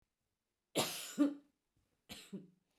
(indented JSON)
{
  "cough_length": "2.8 s",
  "cough_amplitude": 3006,
  "cough_signal_mean_std_ratio": 0.33,
  "survey_phase": "beta (2021-08-13 to 2022-03-07)",
  "age": "65+",
  "gender": "Female",
  "wearing_mask": "No",
  "symptom_none": true,
  "smoker_status": "Never smoked",
  "respiratory_condition_asthma": false,
  "respiratory_condition_other": false,
  "recruitment_source": "REACT",
  "submission_delay": "1 day",
  "covid_test_result": "Negative",
  "covid_test_method": "RT-qPCR"
}